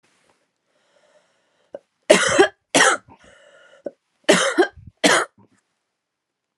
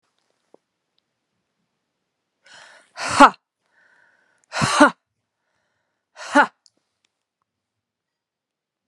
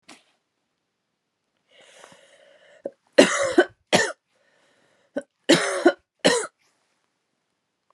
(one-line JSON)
{"cough_length": "6.6 s", "cough_amplitude": 32768, "cough_signal_mean_std_ratio": 0.33, "exhalation_length": "8.9 s", "exhalation_amplitude": 32768, "exhalation_signal_mean_std_ratio": 0.19, "three_cough_length": "7.9 s", "three_cough_amplitude": 32331, "three_cough_signal_mean_std_ratio": 0.28, "survey_phase": "alpha (2021-03-01 to 2021-08-12)", "age": "45-64", "gender": "Female", "wearing_mask": "No", "symptom_none": true, "smoker_status": "Ex-smoker", "respiratory_condition_asthma": false, "respiratory_condition_other": false, "recruitment_source": "REACT", "submission_delay": "2 days", "covid_test_result": "Negative", "covid_test_method": "RT-qPCR"}